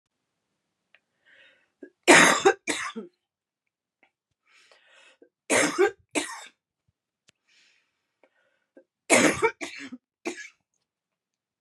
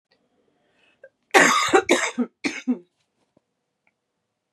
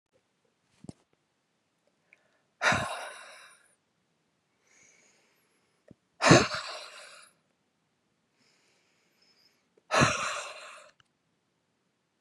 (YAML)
three_cough_length: 11.6 s
three_cough_amplitude: 28750
three_cough_signal_mean_std_ratio: 0.27
cough_length: 4.5 s
cough_amplitude: 32015
cough_signal_mean_std_ratio: 0.34
exhalation_length: 12.2 s
exhalation_amplitude: 22699
exhalation_signal_mean_std_ratio: 0.23
survey_phase: beta (2021-08-13 to 2022-03-07)
age: 45-64
gender: Female
wearing_mask: 'No'
symptom_cough_any: true
symptom_runny_or_blocked_nose: true
symptom_sore_throat: true
symptom_abdominal_pain: true
symptom_fatigue: true
symptom_fever_high_temperature: true
symptom_headache: true
symptom_change_to_sense_of_smell_or_taste: true
symptom_other: true
symptom_onset: 3 days
smoker_status: Ex-smoker
respiratory_condition_asthma: false
respiratory_condition_other: false
recruitment_source: Test and Trace
submission_delay: 1 day
covid_test_result: Positive
covid_test_method: RT-qPCR
covid_ct_value: 21.4
covid_ct_gene: N gene